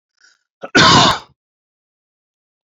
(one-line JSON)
{"cough_length": "2.6 s", "cough_amplitude": 31266, "cough_signal_mean_std_ratio": 0.34, "survey_phase": "beta (2021-08-13 to 2022-03-07)", "age": "45-64", "gender": "Male", "wearing_mask": "No", "symptom_none": true, "smoker_status": "Never smoked", "respiratory_condition_asthma": false, "respiratory_condition_other": false, "recruitment_source": "REACT", "submission_delay": "2 days", "covid_test_result": "Negative", "covid_test_method": "RT-qPCR", "influenza_a_test_result": "Negative", "influenza_b_test_result": "Negative"}